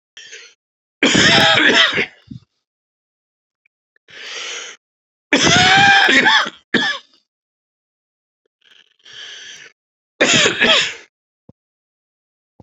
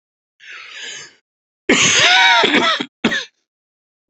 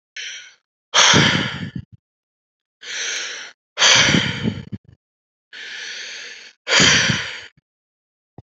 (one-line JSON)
{"three_cough_length": "12.6 s", "three_cough_amplitude": 32531, "three_cough_signal_mean_std_ratio": 0.43, "cough_length": "4.1 s", "cough_amplitude": 32767, "cough_signal_mean_std_ratio": 0.5, "exhalation_length": "8.4 s", "exhalation_amplitude": 32768, "exhalation_signal_mean_std_ratio": 0.45, "survey_phase": "beta (2021-08-13 to 2022-03-07)", "age": "45-64", "gender": "Male", "wearing_mask": "No", "symptom_cough_any": true, "symptom_runny_or_blocked_nose": true, "symptom_diarrhoea": true, "symptom_fatigue": true, "symptom_fever_high_temperature": true, "smoker_status": "Ex-smoker", "respiratory_condition_asthma": false, "respiratory_condition_other": false, "recruitment_source": "Test and Trace", "submission_delay": "1 day", "covid_test_result": "Positive", "covid_test_method": "RT-qPCR", "covid_ct_value": 24.7, "covid_ct_gene": "ORF1ab gene"}